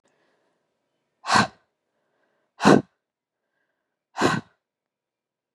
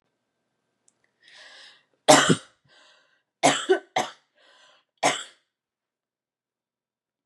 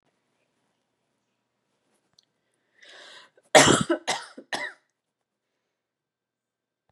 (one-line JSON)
{"exhalation_length": "5.5 s", "exhalation_amplitude": 28080, "exhalation_signal_mean_std_ratio": 0.23, "three_cough_length": "7.3 s", "three_cough_amplitude": 32767, "three_cough_signal_mean_std_ratio": 0.24, "cough_length": "6.9 s", "cough_amplitude": 29147, "cough_signal_mean_std_ratio": 0.2, "survey_phase": "beta (2021-08-13 to 2022-03-07)", "age": "18-44", "gender": "Female", "wearing_mask": "No", "symptom_runny_or_blocked_nose": true, "symptom_onset": "12 days", "smoker_status": "Ex-smoker", "respiratory_condition_asthma": false, "respiratory_condition_other": false, "recruitment_source": "REACT", "submission_delay": "1 day", "covid_test_result": "Negative", "covid_test_method": "RT-qPCR", "influenza_a_test_result": "Negative", "influenza_b_test_result": "Negative"}